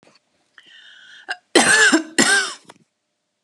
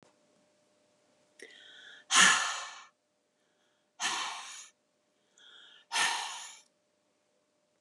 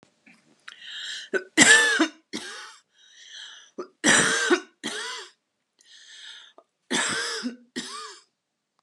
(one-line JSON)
{"cough_length": "3.4 s", "cough_amplitude": 32200, "cough_signal_mean_std_ratio": 0.41, "exhalation_length": "7.8 s", "exhalation_amplitude": 11325, "exhalation_signal_mean_std_ratio": 0.31, "three_cough_length": "8.8 s", "three_cough_amplitude": 30851, "three_cough_signal_mean_std_ratio": 0.39, "survey_phase": "beta (2021-08-13 to 2022-03-07)", "age": "45-64", "gender": "Female", "wearing_mask": "No", "symptom_none": true, "smoker_status": "Ex-smoker", "respiratory_condition_asthma": false, "respiratory_condition_other": false, "recruitment_source": "REACT", "submission_delay": "1 day", "covid_test_result": "Negative", "covid_test_method": "RT-qPCR"}